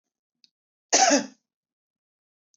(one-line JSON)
{"cough_length": "2.6 s", "cough_amplitude": 14835, "cough_signal_mean_std_ratio": 0.27, "survey_phase": "beta (2021-08-13 to 2022-03-07)", "age": "65+", "gender": "Female", "wearing_mask": "No", "symptom_sore_throat": true, "symptom_onset": "3 days", "smoker_status": "Never smoked", "respiratory_condition_asthma": false, "respiratory_condition_other": false, "recruitment_source": "REACT", "submission_delay": "1 day", "covid_test_result": "Negative", "covid_test_method": "RT-qPCR", "influenza_a_test_result": "Negative", "influenza_b_test_result": "Negative"}